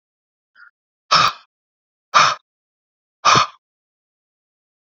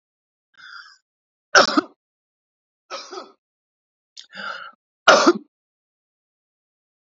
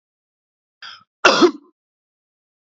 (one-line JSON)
{"exhalation_length": "4.9 s", "exhalation_amplitude": 31035, "exhalation_signal_mean_std_ratio": 0.28, "three_cough_length": "7.1 s", "three_cough_amplitude": 32767, "three_cough_signal_mean_std_ratio": 0.23, "cough_length": "2.7 s", "cough_amplitude": 28391, "cough_signal_mean_std_ratio": 0.25, "survey_phase": "beta (2021-08-13 to 2022-03-07)", "age": "18-44", "gender": "Male", "wearing_mask": "No", "symptom_none": true, "smoker_status": "Never smoked", "respiratory_condition_asthma": false, "respiratory_condition_other": false, "recruitment_source": "Test and Trace", "submission_delay": "0 days", "covid_test_result": "Negative", "covid_test_method": "LFT"}